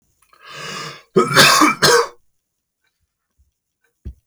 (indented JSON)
{
  "cough_length": "4.3 s",
  "cough_amplitude": 32768,
  "cough_signal_mean_std_ratio": 0.38,
  "survey_phase": "alpha (2021-03-01 to 2021-08-12)",
  "age": "45-64",
  "gender": "Male",
  "wearing_mask": "No",
  "symptom_none": true,
  "smoker_status": "Ex-smoker",
  "respiratory_condition_asthma": false,
  "respiratory_condition_other": false,
  "recruitment_source": "REACT",
  "submission_delay": "1 day",
  "covid_test_result": "Negative",
  "covid_test_method": "RT-qPCR"
}